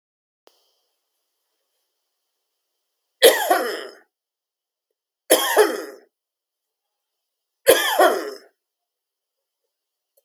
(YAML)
three_cough_length: 10.2 s
three_cough_amplitude: 32768
three_cough_signal_mean_std_ratio: 0.28
survey_phase: beta (2021-08-13 to 2022-03-07)
age: 45-64
gender: Male
wearing_mask: 'No'
symptom_other: true
symptom_onset: 5 days
smoker_status: Never smoked
respiratory_condition_asthma: false
respiratory_condition_other: false
recruitment_source: REACT
submission_delay: 1 day
covid_test_result: Negative
covid_test_method: RT-qPCR
influenza_a_test_result: Negative
influenza_b_test_result: Negative